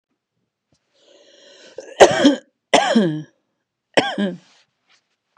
{"cough_length": "5.4 s", "cough_amplitude": 32768, "cough_signal_mean_std_ratio": 0.33, "survey_phase": "beta (2021-08-13 to 2022-03-07)", "age": "45-64", "gender": "Female", "wearing_mask": "No", "symptom_none": true, "smoker_status": "Ex-smoker", "respiratory_condition_asthma": false, "respiratory_condition_other": false, "recruitment_source": "REACT", "submission_delay": "2 days", "covid_test_result": "Negative", "covid_test_method": "RT-qPCR", "influenza_a_test_result": "Negative", "influenza_b_test_result": "Negative"}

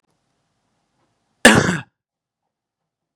{"cough_length": "3.2 s", "cough_amplitude": 32768, "cough_signal_mean_std_ratio": 0.22, "survey_phase": "beta (2021-08-13 to 2022-03-07)", "age": "18-44", "gender": "Male", "wearing_mask": "No", "symptom_none": true, "smoker_status": "Never smoked", "respiratory_condition_asthma": false, "respiratory_condition_other": false, "recruitment_source": "Test and Trace", "submission_delay": "-1 day", "covid_test_result": "Negative", "covid_test_method": "LFT"}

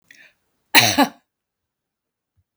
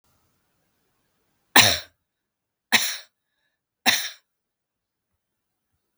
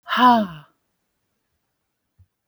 {"cough_length": "2.6 s", "cough_amplitude": 32768, "cough_signal_mean_std_ratio": 0.26, "three_cough_length": "6.0 s", "three_cough_amplitude": 32766, "three_cough_signal_mean_std_ratio": 0.22, "exhalation_length": "2.5 s", "exhalation_amplitude": 22576, "exhalation_signal_mean_std_ratio": 0.31, "survey_phase": "beta (2021-08-13 to 2022-03-07)", "age": "65+", "gender": "Female", "wearing_mask": "No", "symptom_none": true, "smoker_status": "Never smoked", "respiratory_condition_asthma": false, "respiratory_condition_other": false, "recruitment_source": "REACT", "submission_delay": "1 day", "covid_test_result": "Negative", "covid_test_method": "RT-qPCR", "influenza_a_test_result": "Unknown/Void", "influenza_b_test_result": "Unknown/Void"}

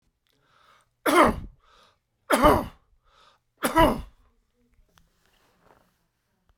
{"three_cough_length": "6.6 s", "three_cough_amplitude": 22384, "three_cough_signal_mean_std_ratio": 0.3, "survey_phase": "alpha (2021-03-01 to 2021-08-12)", "age": "65+", "gender": "Male", "wearing_mask": "No", "symptom_cough_any": true, "symptom_fatigue": true, "symptom_onset": "4 days", "smoker_status": "Ex-smoker", "respiratory_condition_asthma": false, "respiratory_condition_other": false, "recruitment_source": "Test and Trace", "submission_delay": "2 days", "covid_test_result": "Positive", "covid_test_method": "RT-qPCR", "covid_ct_value": 19.0, "covid_ct_gene": "ORF1ab gene"}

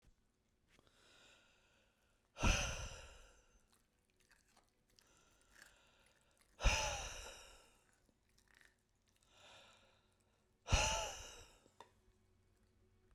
{"exhalation_length": "13.1 s", "exhalation_amplitude": 3002, "exhalation_signal_mean_std_ratio": 0.28, "survey_phase": "beta (2021-08-13 to 2022-03-07)", "age": "45-64", "gender": "Male", "wearing_mask": "No", "symptom_none": true, "smoker_status": "Never smoked", "respiratory_condition_asthma": false, "respiratory_condition_other": false, "recruitment_source": "REACT", "submission_delay": "1 day", "covid_test_result": "Negative", "covid_test_method": "RT-qPCR"}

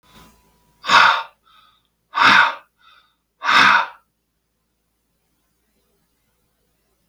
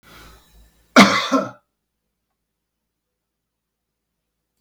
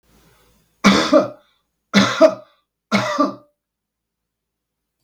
{"exhalation_length": "7.1 s", "exhalation_amplitude": 32766, "exhalation_signal_mean_std_ratio": 0.32, "cough_length": "4.6 s", "cough_amplitude": 32768, "cough_signal_mean_std_ratio": 0.22, "three_cough_length": "5.0 s", "three_cough_amplitude": 32768, "three_cough_signal_mean_std_ratio": 0.36, "survey_phase": "beta (2021-08-13 to 2022-03-07)", "age": "65+", "gender": "Male", "wearing_mask": "No", "symptom_none": true, "smoker_status": "Never smoked", "respiratory_condition_asthma": false, "respiratory_condition_other": false, "recruitment_source": "REACT", "submission_delay": "3 days", "covid_test_result": "Negative", "covid_test_method": "RT-qPCR", "influenza_a_test_result": "Negative", "influenza_b_test_result": "Negative"}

